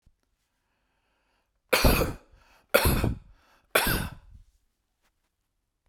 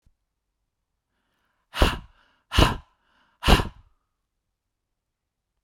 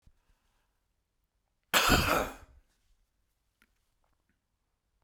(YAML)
three_cough_length: 5.9 s
three_cough_amplitude: 23134
three_cough_signal_mean_std_ratio: 0.34
exhalation_length: 5.6 s
exhalation_amplitude: 26581
exhalation_signal_mean_std_ratio: 0.24
cough_length: 5.0 s
cough_amplitude: 10030
cough_signal_mean_std_ratio: 0.26
survey_phase: beta (2021-08-13 to 2022-03-07)
age: 45-64
gender: Male
wearing_mask: 'No'
symptom_none: true
smoker_status: Current smoker (e-cigarettes or vapes only)
respiratory_condition_asthma: false
respiratory_condition_other: false
recruitment_source: REACT
submission_delay: 1 day
covid_test_result: Negative
covid_test_method: RT-qPCR